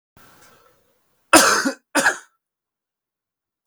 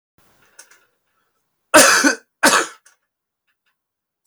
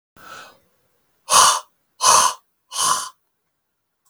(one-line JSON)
{"cough_length": "3.7 s", "cough_amplitude": 32768, "cough_signal_mean_std_ratio": 0.3, "three_cough_length": "4.3 s", "three_cough_amplitude": 32768, "three_cough_signal_mean_std_ratio": 0.3, "exhalation_length": "4.1 s", "exhalation_amplitude": 32768, "exhalation_signal_mean_std_ratio": 0.37, "survey_phase": "beta (2021-08-13 to 2022-03-07)", "age": "45-64", "gender": "Male", "wearing_mask": "No", "symptom_none": true, "smoker_status": "Ex-smoker", "respiratory_condition_asthma": false, "respiratory_condition_other": false, "recruitment_source": "REACT", "submission_delay": "1 day", "covid_test_result": "Negative", "covid_test_method": "RT-qPCR", "influenza_a_test_result": "Negative", "influenza_b_test_result": "Negative"}